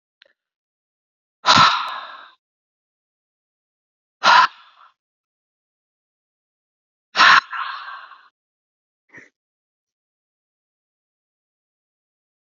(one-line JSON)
{"exhalation_length": "12.5 s", "exhalation_amplitude": 32768, "exhalation_signal_mean_std_ratio": 0.23, "survey_phase": "beta (2021-08-13 to 2022-03-07)", "age": "18-44", "gender": "Male", "wearing_mask": "No", "symptom_fatigue": true, "symptom_onset": "13 days", "smoker_status": "Ex-smoker", "respiratory_condition_asthma": false, "respiratory_condition_other": false, "recruitment_source": "REACT", "submission_delay": "1 day", "covid_test_result": "Positive", "covid_test_method": "RT-qPCR", "covid_ct_value": 36.9, "covid_ct_gene": "E gene", "influenza_a_test_result": "Negative", "influenza_b_test_result": "Negative"}